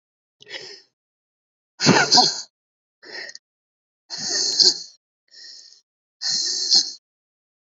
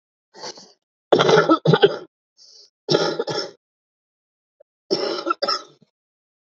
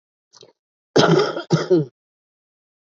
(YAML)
exhalation_length: 7.8 s
exhalation_amplitude: 29612
exhalation_signal_mean_std_ratio: 0.37
three_cough_length: 6.5 s
three_cough_amplitude: 32767
three_cough_signal_mean_std_ratio: 0.38
cough_length: 2.8 s
cough_amplitude: 32312
cough_signal_mean_std_ratio: 0.4
survey_phase: beta (2021-08-13 to 2022-03-07)
age: 45-64
gender: Female
wearing_mask: 'No'
symptom_cough_any: true
symptom_runny_or_blocked_nose: true
symptom_shortness_of_breath: true
symptom_fatigue: true
symptom_headache: true
symptom_change_to_sense_of_smell_or_taste: true
symptom_onset: 2 days
smoker_status: Current smoker (11 or more cigarettes per day)
respiratory_condition_asthma: false
respiratory_condition_other: false
recruitment_source: Test and Trace
submission_delay: 2 days
covid_test_result: Positive
covid_test_method: RT-qPCR
covid_ct_value: 28.2
covid_ct_gene: ORF1ab gene